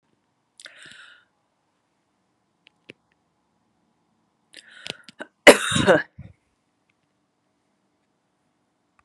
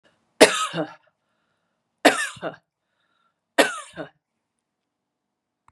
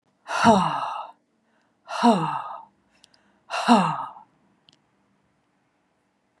{"cough_length": "9.0 s", "cough_amplitude": 32768, "cough_signal_mean_std_ratio": 0.16, "three_cough_length": "5.7 s", "three_cough_amplitude": 32768, "three_cough_signal_mean_std_ratio": 0.24, "exhalation_length": "6.4 s", "exhalation_amplitude": 25224, "exhalation_signal_mean_std_ratio": 0.37, "survey_phase": "beta (2021-08-13 to 2022-03-07)", "age": "65+", "gender": "Female", "wearing_mask": "No", "symptom_none": true, "smoker_status": "Never smoked", "respiratory_condition_asthma": false, "respiratory_condition_other": false, "recruitment_source": "REACT", "submission_delay": "2 days", "covid_test_result": "Negative", "covid_test_method": "RT-qPCR", "influenza_a_test_result": "Negative", "influenza_b_test_result": "Negative"}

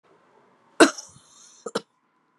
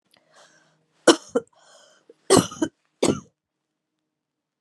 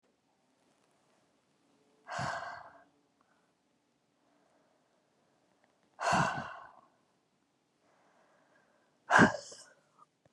{"cough_length": "2.4 s", "cough_amplitude": 30815, "cough_signal_mean_std_ratio": 0.19, "three_cough_length": "4.6 s", "three_cough_amplitude": 32148, "three_cough_signal_mean_std_ratio": 0.23, "exhalation_length": "10.3 s", "exhalation_amplitude": 12150, "exhalation_signal_mean_std_ratio": 0.23, "survey_phase": "beta (2021-08-13 to 2022-03-07)", "age": "45-64", "gender": "Female", "wearing_mask": "No", "symptom_sore_throat": true, "symptom_headache": true, "symptom_change_to_sense_of_smell_or_taste": true, "symptom_other": true, "smoker_status": "Ex-smoker", "respiratory_condition_asthma": false, "respiratory_condition_other": false, "recruitment_source": "Test and Trace", "submission_delay": "1 day", "covid_test_result": "Positive", "covid_test_method": "LFT"}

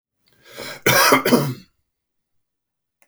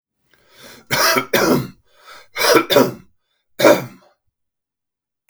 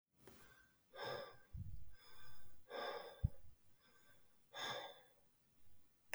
{"cough_length": "3.1 s", "cough_amplitude": 32573, "cough_signal_mean_std_ratio": 0.38, "three_cough_length": "5.3 s", "three_cough_amplitude": 32573, "three_cough_signal_mean_std_ratio": 0.41, "exhalation_length": "6.1 s", "exhalation_amplitude": 1966, "exhalation_signal_mean_std_ratio": 0.67, "survey_phase": "beta (2021-08-13 to 2022-03-07)", "age": "45-64", "gender": "Male", "wearing_mask": "No", "symptom_none": true, "smoker_status": "Ex-smoker", "respiratory_condition_asthma": false, "respiratory_condition_other": false, "recruitment_source": "REACT", "submission_delay": "1 day", "covid_test_result": "Negative", "covid_test_method": "RT-qPCR", "influenza_a_test_result": "Negative", "influenza_b_test_result": "Negative"}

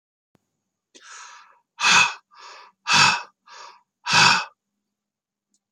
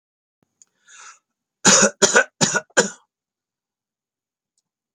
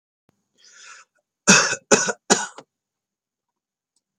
{"exhalation_length": "5.7 s", "exhalation_amplitude": 26785, "exhalation_signal_mean_std_ratio": 0.34, "cough_length": "4.9 s", "cough_amplitude": 32767, "cough_signal_mean_std_ratio": 0.29, "three_cough_length": "4.2 s", "three_cough_amplitude": 32720, "three_cough_signal_mean_std_ratio": 0.27, "survey_phase": "alpha (2021-03-01 to 2021-08-12)", "age": "65+", "gender": "Male", "wearing_mask": "No", "symptom_none": true, "smoker_status": "Ex-smoker", "respiratory_condition_asthma": false, "respiratory_condition_other": false, "recruitment_source": "REACT", "submission_delay": "1 day", "covid_test_result": "Negative", "covid_test_method": "RT-qPCR"}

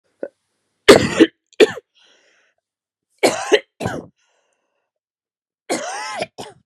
{"three_cough_length": "6.7 s", "three_cough_amplitude": 32768, "three_cough_signal_mean_std_ratio": 0.28, "survey_phase": "beta (2021-08-13 to 2022-03-07)", "age": "18-44", "gender": "Female", "wearing_mask": "No", "symptom_cough_any": true, "symptom_runny_or_blocked_nose": true, "symptom_sore_throat": true, "symptom_abdominal_pain": true, "symptom_fatigue": true, "symptom_headache": true, "smoker_status": "Never smoked", "respiratory_condition_asthma": false, "respiratory_condition_other": false, "recruitment_source": "Test and Trace", "submission_delay": "1 day", "covid_test_result": "Positive", "covid_test_method": "RT-qPCR", "covid_ct_value": 32.4, "covid_ct_gene": "ORF1ab gene", "covid_ct_mean": 33.4, "covid_viral_load": "11 copies/ml", "covid_viral_load_category": "Minimal viral load (< 10K copies/ml)"}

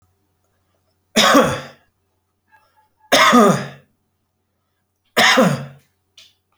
{"three_cough_length": "6.6 s", "three_cough_amplitude": 31336, "three_cough_signal_mean_std_ratio": 0.38, "survey_phase": "beta (2021-08-13 to 2022-03-07)", "age": "65+", "gender": "Male", "wearing_mask": "No", "symptom_cough_any": true, "smoker_status": "Ex-smoker", "respiratory_condition_asthma": false, "respiratory_condition_other": false, "recruitment_source": "REACT", "submission_delay": "4 days", "covid_test_result": "Negative", "covid_test_method": "RT-qPCR"}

